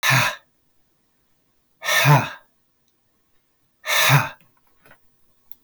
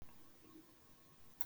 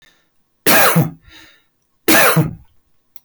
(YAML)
exhalation_length: 5.6 s
exhalation_amplitude: 26296
exhalation_signal_mean_std_ratio: 0.36
cough_length: 1.5 s
cough_amplitude: 4057
cough_signal_mean_std_ratio: 0.39
three_cough_length: 3.2 s
three_cough_amplitude: 27904
three_cough_signal_mean_std_ratio: 0.47
survey_phase: beta (2021-08-13 to 2022-03-07)
age: 45-64
gender: Male
wearing_mask: 'No'
symptom_none: true
smoker_status: Ex-smoker
respiratory_condition_asthma: false
respiratory_condition_other: false
recruitment_source: REACT
submission_delay: 1 day
covid_test_result: Negative
covid_test_method: RT-qPCR